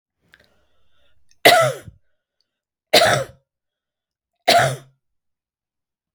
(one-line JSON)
{"three_cough_length": "6.1 s", "three_cough_amplitude": 32768, "three_cough_signal_mean_std_ratio": 0.3, "survey_phase": "beta (2021-08-13 to 2022-03-07)", "age": "65+", "gender": "Female", "wearing_mask": "No", "symptom_none": true, "smoker_status": "Ex-smoker", "respiratory_condition_asthma": false, "respiratory_condition_other": false, "recruitment_source": "REACT", "submission_delay": "1 day", "covid_test_result": "Negative", "covid_test_method": "RT-qPCR", "influenza_a_test_result": "Negative", "influenza_b_test_result": "Negative"}